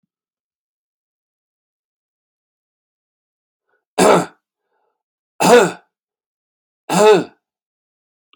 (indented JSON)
{
  "three_cough_length": "8.4 s",
  "three_cough_amplitude": 30312,
  "three_cough_signal_mean_std_ratio": 0.26,
  "survey_phase": "beta (2021-08-13 to 2022-03-07)",
  "age": "45-64",
  "gender": "Male",
  "wearing_mask": "No",
  "symptom_cough_any": true,
  "symptom_runny_or_blocked_nose": true,
  "symptom_sore_throat": true,
  "smoker_status": "Ex-smoker",
  "respiratory_condition_asthma": false,
  "respiratory_condition_other": false,
  "recruitment_source": "Test and Trace",
  "submission_delay": "1 day",
  "covid_test_result": "Positive",
  "covid_test_method": "ePCR"
}